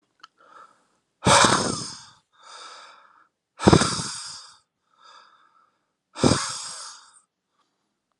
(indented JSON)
{
  "exhalation_length": "8.2 s",
  "exhalation_amplitude": 32736,
  "exhalation_signal_mean_std_ratio": 0.31,
  "survey_phase": "alpha (2021-03-01 to 2021-08-12)",
  "age": "18-44",
  "gender": "Male",
  "wearing_mask": "No",
  "symptom_headache": true,
  "symptom_change_to_sense_of_smell_or_taste": true,
  "smoker_status": "Current smoker (11 or more cigarettes per day)",
  "respiratory_condition_asthma": false,
  "respiratory_condition_other": false,
  "recruitment_source": "Test and Trace",
  "submission_delay": "1 day",
  "covid_test_result": "Positive",
  "covid_test_method": "RT-qPCR"
}